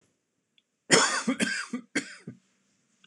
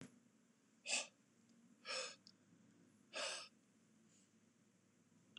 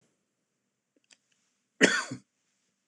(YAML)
three_cough_length: 3.1 s
three_cough_amplitude: 22492
three_cough_signal_mean_std_ratio: 0.38
exhalation_length: 5.4 s
exhalation_amplitude: 1535
exhalation_signal_mean_std_ratio: 0.38
cough_length: 2.9 s
cough_amplitude: 17960
cough_signal_mean_std_ratio: 0.21
survey_phase: beta (2021-08-13 to 2022-03-07)
age: 45-64
gender: Male
wearing_mask: 'No'
symptom_none: true
symptom_onset: 12 days
smoker_status: Never smoked
respiratory_condition_asthma: false
respiratory_condition_other: false
recruitment_source: REACT
submission_delay: 1 day
covid_test_result: Negative
covid_test_method: RT-qPCR